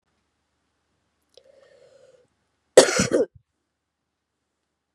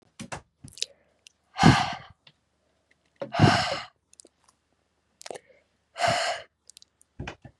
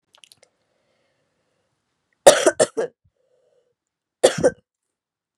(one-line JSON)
{"cough_length": "4.9 s", "cough_amplitude": 32768, "cough_signal_mean_std_ratio": 0.19, "exhalation_length": "7.6 s", "exhalation_amplitude": 20297, "exhalation_signal_mean_std_ratio": 0.3, "three_cough_length": "5.4 s", "three_cough_amplitude": 32768, "three_cough_signal_mean_std_ratio": 0.22, "survey_phase": "beta (2021-08-13 to 2022-03-07)", "age": "18-44", "gender": "Female", "wearing_mask": "No", "symptom_runny_or_blocked_nose": true, "symptom_shortness_of_breath": true, "symptom_sore_throat": true, "symptom_fatigue": true, "symptom_fever_high_temperature": true, "symptom_headache": true, "symptom_change_to_sense_of_smell_or_taste": true, "symptom_loss_of_taste": true, "symptom_other": true, "symptom_onset": "5 days", "smoker_status": "Never smoked", "respiratory_condition_asthma": false, "respiratory_condition_other": false, "recruitment_source": "Test and Trace", "submission_delay": "2 days", "covid_test_result": "Positive", "covid_test_method": "RT-qPCR", "covid_ct_value": 17.0, "covid_ct_gene": "ORF1ab gene", "covid_ct_mean": 17.6, "covid_viral_load": "1700000 copies/ml", "covid_viral_load_category": "High viral load (>1M copies/ml)"}